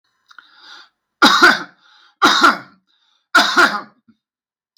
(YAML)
three_cough_length: 4.8 s
three_cough_amplitude: 32768
three_cough_signal_mean_std_ratio: 0.4
survey_phase: beta (2021-08-13 to 2022-03-07)
age: 45-64
gender: Male
wearing_mask: 'No'
symptom_none: true
smoker_status: Ex-smoker
respiratory_condition_asthma: false
respiratory_condition_other: false
recruitment_source: REACT
submission_delay: 6 days
covid_test_result: Negative
covid_test_method: RT-qPCR
influenza_a_test_result: Negative
influenza_b_test_result: Negative